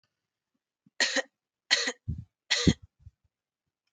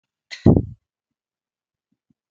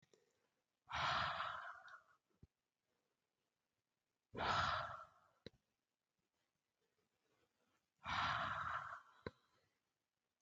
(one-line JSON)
{"three_cough_length": "3.9 s", "three_cough_amplitude": 15292, "three_cough_signal_mean_std_ratio": 0.3, "cough_length": "2.3 s", "cough_amplitude": 32768, "cough_signal_mean_std_ratio": 0.2, "exhalation_length": "10.4 s", "exhalation_amplitude": 1378, "exhalation_signal_mean_std_ratio": 0.39, "survey_phase": "beta (2021-08-13 to 2022-03-07)", "age": "18-44", "gender": "Female", "wearing_mask": "No", "symptom_none": true, "smoker_status": "Never smoked", "respiratory_condition_asthma": false, "respiratory_condition_other": false, "recruitment_source": "REACT", "submission_delay": "12 days", "covid_test_result": "Negative", "covid_test_method": "RT-qPCR", "influenza_a_test_result": "Negative", "influenza_b_test_result": "Negative"}